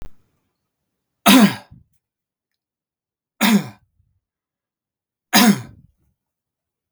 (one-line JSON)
{"three_cough_length": "6.9 s", "three_cough_amplitude": 32768, "three_cough_signal_mean_std_ratio": 0.27, "survey_phase": "beta (2021-08-13 to 2022-03-07)", "age": "18-44", "gender": "Male", "wearing_mask": "No", "symptom_runny_or_blocked_nose": true, "symptom_change_to_sense_of_smell_or_taste": true, "smoker_status": "Never smoked", "respiratory_condition_asthma": false, "respiratory_condition_other": false, "recruitment_source": "Test and Trace", "submission_delay": "2 days", "covid_test_result": "Positive", "covid_test_method": "RT-qPCR", "covid_ct_value": 31.2, "covid_ct_gene": "ORF1ab gene", "covid_ct_mean": 33.1, "covid_viral_load": "14 copies/ml", "covid_viral_load_category": "Minimal viral load (< 10K copies/ml)"}